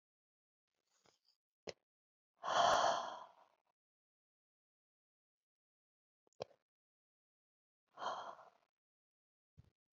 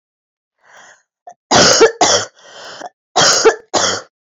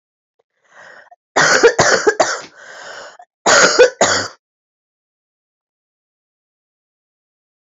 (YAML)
exhalation_length: 10.0 s
exhalation_amplitude: 3337
exhalation_signal_mean_std_ratio: 0.23
three_cough_length: 4.3 s
three_cough_amplitude: 32768
three_cough_signal_mean_std_ratio: 0.47
cough_length: 7.8 s
cough_amplitude: 32767
cough_signal_mean_std_ratio: 0.36
survey_phase: beta (2021-08-13 to 2022-03-07)
age: 18-44
gender: Female
wearing_mask: 'No'
symptom_cough_any: true
symptom_runny_or_blocked_nose: true
symptom_sore_throat: true
symptom_fatigue: true
symptom_headache: true
symptom_onset: 9 days
smoker_status: Never smoked
respiratory_condition_asthma: false
respiratory_condition_other: false
recruitment_source: Test and Trace
submission_delay: 1 day
covid_test_result: Positive
covid_test_method: RT-qPCR
covid_ct_value: 19.1
covid_ct_gene: N gene